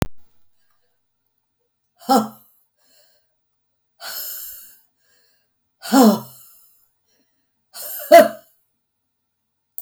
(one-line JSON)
{"exhalation_length": "9.8 s", "exhalation_amplitude": 32768, "exhalation_signal_mean_std_ratio": 0.23, "survey_phase": "beta (2021-08-13 to 2022-03-07)", "age": "65+", "gender": "Female", "wearing_mask": "No", "symptom_none": true, "symptom_onset": "7 days", "smoker_status": "Never smoked", "respiratory_condition_asthma": false, "respiratory_condition_other": false, "recruitment_source": "REACT", "submission_delay": "0 days", "covid_test_result": "Negative", "covid_test_method": "RT-qPCR", "influenza_a_test_result": "Negative", "influenza_b_test_result": "Negative"}